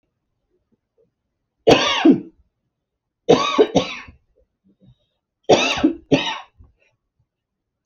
{"three_cough_length": "7.9 s", "three_cough_amplitude": 32767, "three_cough_signal_mean_std_ratio": 0.34, "survey_phase": "beta (2021-08-13 to 2022-03-07)", "age": "18-44", "gender": "Female", "wearing_mask": "No", "symptom_none": true, "symptom_onset": "4 days", "smoker_status": "Ex-smoker", "respiratory_condition_asthma": false, "respiratory_condition_other": false, "recruitment_source": "REACT", "submission_delay": "11 days", "covid_test_result": "Negative", "covid_test_method": "RT-qPCR"}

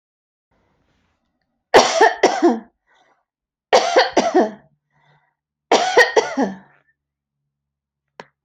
{"three_cough_length": "8.4 s", "three_cough_amplitude": 30562, "three_cough_signal_mean_std_ratio": 0.37, "survey_phase": "alpha (2021-03-01 to 2021-08-12)", "age": "45-64", "gender": "Female", "wearing_mask": "Yes", "symptom_fatigue": true, "symptom_headache": true, "symptom_onset": "5 days", "smoker_status": "Never smoked", "respiratory_condition_asthma": true, "respiratory_condition_other": false, "recruitment_source": "REACT", "submission_delay": "2 days", "covid_test_result": "Negative", "covid_test_method": "RT-qPCR"}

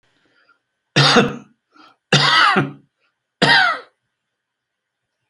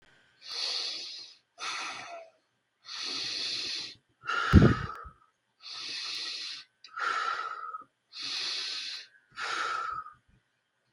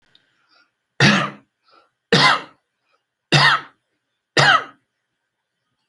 {"three_cough_length": "5.3 s", "three_cough_amplitude": 29930, "three_cough_signal_mean_std_ratio": 0.41, "exhalation_length": "10.9 s", "exhalation_amplitude": 16371, "exhalation_signal_mean_std_ratio": 0.47, "cough_length": "5.9 s", "cough_amplitude": 29702, "cough_signal_mean_std_ratio": 0.35, "survey_phase": "alpha (2021-03-01 to 2021-08-12)", "age": "65+", "gender": "Male", "wearing_mask": "No", "symptom_none": true, "smoker_status": "Ex-smoker", "respiratory_condition_asthma": false, "respiratory_condition_other": false, "recruitment_source": "REACT", "submission_delay": "6 days", "covid_test_result": "Negative", "covid_test_method": "RT-qPCR"}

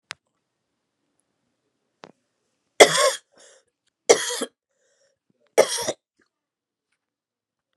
{"three_cough_length": "7.8 s", "three_cough_amplitude": 32768, "three_cough_signal_mean_std_ratio": 0.21, "survey_phase": "beta (2021-08-13 to 2022-03-07)", "age": "45-64", "gender": "Female", "wearing_mask": "No", "symptom_cough_any": true, "symptom_runny_or_blocked_nose": true, "symptom_fatigue": true, "symptom_headache": true, "symptom_onset": "3 days", "smoker_status": "Never smoked", "respiratory_condition_asthma": false, "respiratory_condition_other": false, "recruitment_source": "Test and Trace", "submission_delay": "2 days", "covid_test_result": "Positive", "covid_test_method": "RT-qPCR", "covid_ct_value": 16.0, "covid_ct_gene": "ORF1ab gene", "covid_ct_mean": 16.9, "covid_viral_load": "2900000 copies/ml", "covid_viral_load_category": "High viral load (>1M copies/ml)"}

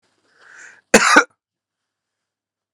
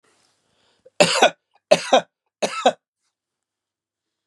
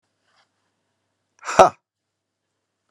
{"cough_length": "2.7 s", "cough_amplitude": 32768, "cough_signal_mean_std_ratio": 0.25, "three_cough_length": "4.3 s", "three_cough_amplitude": 32767, "three_cough_signal_mean_std_ratio": 0.28, "exhalation_length": "2.9 s", "exhalation_amplitude": 32768, "exhalation_signal_mean_std_ratio": 0.16, "survey_phase": "beta (2021-08-13 to 2022-03-07)", "age": "65+", "gender": "Male", "wearing_mask": "No", "symptom_none": true, "smoker_status": "Ex-smoker", "respiratory_condition_asthma": false, "respiratory_condition_other": false, "recruitment_source": "REACT", "submission_delay": "2 days", "covid_test_result": "Negative", "covid_test_method": "RT-qPCR", "influenza_a_test_result": "Negative", "influenza_b_test_result": "Negative"}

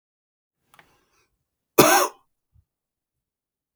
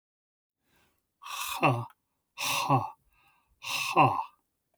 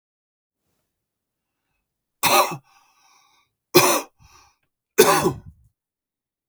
{"cough_length": "3.8 s", "cough_amplitude": 31949, "cough_signal_mean_std_ratio": 0.21, "exhalation_length": "4.8 s", "exhalation_amplitude": 11716, "exhalation_signal_mean_std_ratio": 0.41, "three_cough_length": "6.5 s", "three_cough_amplitude": 32416, "three_cough_signal_mean_std_ratio": 0.28, "survey_phase": "beta (2021-08-13 to 2022-03-07)", "age": "45-64", "gender": "Male", "wearing_mask": "No", "symptom_none": true, "smoker_status": "Ex-smoker", "respiratory_condition_asthma": true, "respiratory_condition_other": false, "recruitment_source": "REACT", "submission_delay": "2 days", "covid_test_result": "Negative", "covid_test_method": "RT-qPCR", "influenza_a_test_result": "Negative", "influenza_b_test_result": "Negative"}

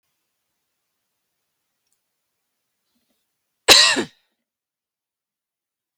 {"three_cough_length": "6.0 s", "three_cough_amplitude": 32768, "three_cough_signal_mean_std_ratio": 0.17, "survey_phase": "beta (2021-08-13 to 2022-03-07)", "age": "45-64", "gender": "Female", "wearing_mask": "No", "symptom_runny_or_blocked_nose": true, "symptom_fatigue": true, "symptom_onset": "11 days", "smoker_status": "Never smoked", "respiratory_condition_asthma": true, "respiratory_condition_other": false, "recruitment_source": "REACT", "submission_delay": "5 days", "covid_test_result": "Negative", "covid_test_method": "RT-qPCR", "influenza_a_test_result": "Negative", "influenza_b_test_result": "Negative"}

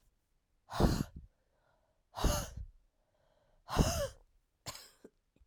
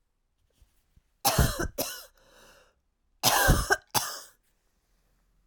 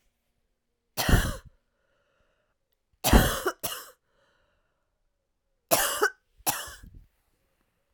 {"exhalation_length": "5.5 s", "exhalation_amplitude": 7547, "exhalation_signal_mean_std_ratio": 0.34, "cough_length": "5.5 s", "cough_amplitude": 13227, "cough_signal_mean_std_ratio": 0.37, "three_cough_length": "7.9 s", "three_cough_amplitude": 21655, "three_cough_signal_mean_std_ratio": 0.3, "survey_phase": "alpha (2021-03-01 to 2021-08-12)", "age": "45-64", "gender": "Female", "wearing_mask": "No", "symptom_cough_any": true, "symptom_new_continuous_cough": true, "symptom_shortness_of_breath": true, "symptom_fatigue": true, "symptom_headache": true, "symptom_change_to_sense_of_smell_or_taste": true, "smoker_status": "Ex-smoker", "respiratory_condition_asthma": false, "respiratory_condition_other": false, "recruitment_source": "Test and Trace", "submission_delay": "2 days", "covid_test_result": "Positive", "covid_test_method": "LFT"}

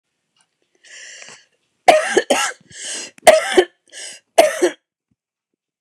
{"three_cough_length": "5.8 s", "three_cough_amplitude": 29204, "three_cough_signal_mean_std_ratio": 0.34, "survey_phase": "beta (2021-08-13 to 2022-03-07)", "age": "65+", "gender": "Female", "wearing_mask": "No", "symptom_cough_any": true, "smoker_status": "Never smoked", "respiratory_condition_asthma": false, "respiratory_condition_other": false, "recruitment_source": "REACT", "submission_delay": "1 day", "covid_test_result": "Negative", "covid_test_method": "RT-qPCR", "influenza_a_test_result": "Unknown/Void", "influenza_b_test_result": "Unknown/Void"}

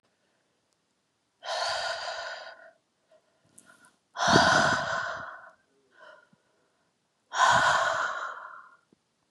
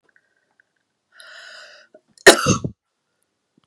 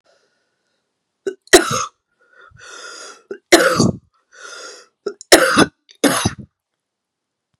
{"exhalation_length": "9.3 s", "exhalation_amplitude": 18174, "exhalation_signal_mean_std_ratio": 0.43, "cough_length": "3.7 s", "cough_amplitude": 32768, "cough_signal_mean_std_ratio": 0.2, "three_cough_length": "7.6 s", "three_cough_amplitude": 32768, "three_cough_signal_mean_std_ratio": 0.32, "survey_phase": "beta (2021-08-13 to 2022-03-07)", "age": "18-44", "gender": "Female", "wearing_mask": "No", "symptom_cough_any": true, "symptom_runny_or_blocked_nose": true, "symptom_shortness_of_breath": true, "symptom_sore_throat": true, "symptom_fatigue": true, "symptom_headache": true, "symptom_change_to_sense_of_smell_or_taste": true, "symptom_onset": "2 days", "smoker_status": "Ex-smoker", "respiratory_condition_asthma": false, "respiratory_condition_other": false, "recruitment_source": "Test and Trace", "submission_delay": "2 days", "covid_test_result": "Positive", "covid_test_method": "LAMP"}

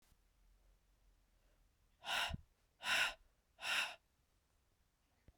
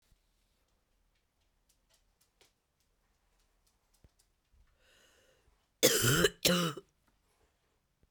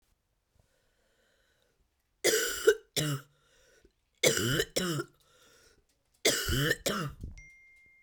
{"exhalation_length": "5.4 s", "exhalation_amplitude": 2196, "exhalation_signal_mean_std_ratio": 0.34, "cough_length": "8.1 s", "cough_amplitude": 9640, "cough_signal_mean_std_ratio": 0.24, "three_cough_length": "8.0 s", "three_cough_amplitude": 11998, "three_cough_signal_mean_std_ratio": 0.41, "survey_phase": "beta (2021-08-13 to 2022-03-07)", "age": "45-64", "gender": "Female", "wearing_mask": "Yes", "symptom_cough_any": true, "symptom_runny_or_blocked_nose": true, "symptom_sore_throat": true, "symptom_change_to_sense_of_smell_or_taste": true, "symptom_onset": "2 days", "smoker_status": "Never smoked", "respiratory_condition_asthma": false, "respiratory_condition_other": false, "recruitment_source": "Test and Trace", "submission_delay": "2 days", "covid_test_result": "Positive", "covid_test_method": "ePCR"}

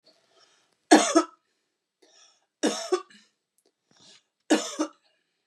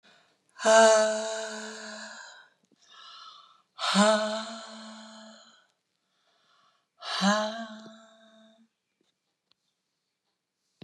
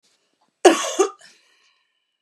{"three_cough_length": "5.5 s", "three_cough_amplitude": 27730, "three_cough_signal_mean_std_ratio": 0.27, "exhalation_length": "10.8 s", "exhalation_amplitude": 15908, "exhalation_signal_mean_std_ratio": 0.36, "cough_length": "2.2 s", "cough_amplitude": 32756, "cough_signal_mean_std_ratio": 0.27, "survey_phase": "beta (2021-08-13 to 2022-03-07)", "age": "45-64", "gender": "Female", "wearing_mask": "No", "symptom_none": true, "symptom_onset": "9 days", "smoker_status": "Never smoked", "respiratory_condition_asthma": false, "respiratory_condition_other": false, "recruitment_source": "REACT", "submission_delay": "0 days", "covid_test_result": "Negative", "covid_test_method": "RT-qPCR", "influenza_a_test_result": "Negative", "influenza_b_test_result": "Negative"}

